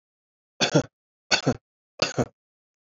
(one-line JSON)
{"three_cough_length": "2.8 s", "three_cough_amplitude": 15922, "three_cough_signal_mean_std_ratio": 0.31, "survey_phase": "beta (2021-08-13 to 2022-03-07)", "age": "18-44", "gender": "Male", "wearing_mask": "No", "symptom_runny_or_blocked_nose": true, "symptom_sore_throat": true, "symptom_fatigue": true, "symptom_headache": true, "symptom_other": true, "symptom_onset": "3 days", "smoker_status": "Never smoked", "respiratory_condition_asthma": false, "respiratory_condition_other": false, "recruitment_source": "Test and Trace", "submission_delay": "2 days", "covid_test_result": "Positive", "covid_test_method": "RT-qPCR", "covid_ct_value": 29.3, "covid_ct_gene": "N gene"}